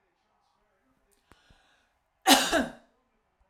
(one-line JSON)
{"three_cough_length": "3.5 s", "three_cough_amplitude": 22551, "three_cough_signal_mean_std_ratio": 0.25, "survey_phase": "alpha (2021-03-01 to 2021-08-12)", "age": "45-64", "gender": "Female", "wearing_mask": "No", "symptom_none": true, "smoker_status": "Never smoked", "respiratory_condition_asthma": false, "respiratory_condition_other": false, "recruitment_source": "REACT", "submission_delay": "1 day", "covid_test_result": "Negative", "covid_test_method": "RT-qPCR"}